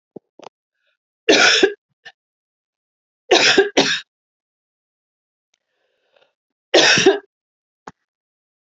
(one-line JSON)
{"three_cough_length": "8.7 s", "three_cough_amplitude": 32507, "three_cough_signal_mean_std_ratio": 0.32, "survey_phase": "beta (2021-08-13 to 2022-03-07)", "age": "45-64", "gender": "Female", "wearing_mask": "No", "symptom_cough_any": true, "symptom_runny_or_blocked_nose": true, "symptom_change_to_sense_of_smell_or_taste": true, "symptom_onset": "2 days", "smoker_status": "Never smoked", "respiratory_condition_asthma": false, "respiratory_condition_other": false, "recruitment_source": "Test and Trace", "submission_delay": "2 days", "covid_test_result": "Positive", "covid_test_method": "RT-qPCR"}